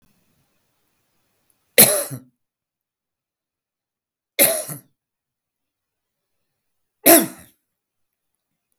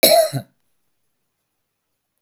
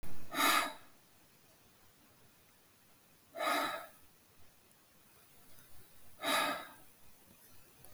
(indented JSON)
{
  "three_cough_length": "8.8 s",
  "three_cough_amplitude": 32768,
  "three_cough_signal_mean_std_ratio": 0.21,
  "cough_length": "2.2 s",
  "cough_amplitude": 32767,
  "cough_signal_mean_std_ratio": 0.3,
  "exhalation_length": "7.9 s",
  "exhalation_amplitude": 4847,
  "exhalation_signal_mean_std_ratio": 0.43,
  "survey_phase": "beta (2021-08-13 to 2022-03-07)",
  "age": "65+",
  "gender": "Male",
  "wearing_mask": "No",
  "symptom_none": true,
  "smoker_status": "Ex-smoker",
  "respiratory_condition_asthma": false,
  "respiratory_condition_other": false,
  "recruitment_source": "REACT",
  "submission_delay": "2 days",
  "covid_test_result": "Negative",
  "covid_test_method": "RT-qPCR",
  "influenza_a_test_result": "Negative",
  "influenza_b_test_result": "Negative"
}